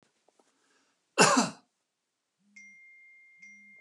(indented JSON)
{
  "cough_length": "3.8 s",
  "cough_amplitude": 15093,
  "cough_signal_mean_std_ratio": 0.24,
  "survey_phase": "beta (2021-08-13 to 2022-03-07)",
  "age": "65+",
  "gender": "Male",
  "wearing_mask": "No",
  "symptom_none": true,
  "smoker_status": "Ex-smoker",
  "respiratory_condition_asthma": false,
  "respiratory_condition_other": false,
  "recruitment_source": "REACT",
  "submission_delay": "1 day",
  "covid_test_result": "Negative",
  "covid_test_method": "RT-qPCR",
  "influenza_a_test_result": "Negative",
  "influenza_b_test_result": "Negative"
}